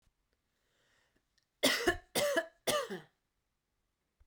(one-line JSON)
{"cough_length": "4.3 s", "cough_amplitude": 6515, "cough_signal_mean_std_ratio": 0.35, "survey_phase": "beta (2021-08-13 to 2022-03-07)", "age": "18-44", "gender": "Female", "wearing_mask": "No", "symptom_fatigue": true, "symptom_headache": true, "symptom_change_to_sense_of_smell_or_taste": true, "smoker_status": "Never smoked", "respiratory_condition_asthma": false, "respiratory_condition_other": false, "recruitment_source": "Test and Trace", "submission_delay": "1 day", "covid_test_result": "Positive", "covid_test_method": "RT-qPCR", "covid_ct_value": 16.0, "covid_ct_gene": "ORF1ab gene", "covid_ct_mean": 16.7, "covid_viral_load": "3300000 copies/ml", "covid_viral_load_category": "High viral load (>1M copies/ml)"}